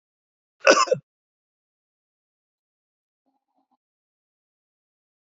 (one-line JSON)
{"cough_length": "5.4 s", "cough_amplitude": 29419, "cough_signal_mean_std_ratio": 0.16, "survey_phase": "alpha (2021-03-01 to 2021-08-12)", "age": "65+", "gender": "Male", "wearing_mask": "No", "symptom_none": true, "smoker_status": "Never smoked", "respiratory_condition_asthma": false, "respiratory_condition_other": false, "recruitment_source": "REACT", "submission_delay": "2 days", "covid_test_result": "Negative", "covid_test_method": "RT-qPCR"}